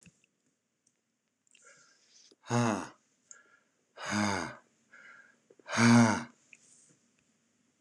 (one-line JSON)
{"exhalation_length": "7.8 s", "exhalation_amplitude": 8470, "exhalation_signal_mean_std_ratio": 0.3, "survey_phase": "beta (2021-08-13 to 2022-03-07)", "age": "45-64", "gender": "Male", "wearing_mask": "No", "symptom_cough_any": true, "symptom_runny_or_blocked_nose": true, "symptom_sore_throat": true, "smoker_status": "Never smoked", "respiratory_condition_asthma": false, "respiratory_condition_other": false, "recruitment_source": "REACT", "submission_delay": "3 days", "covid_test_result": "Negative", "covid_test_method": "RT-qPCR", "influenza_a_test_result": "Negative", "influenza_b_test_result": "Negative"}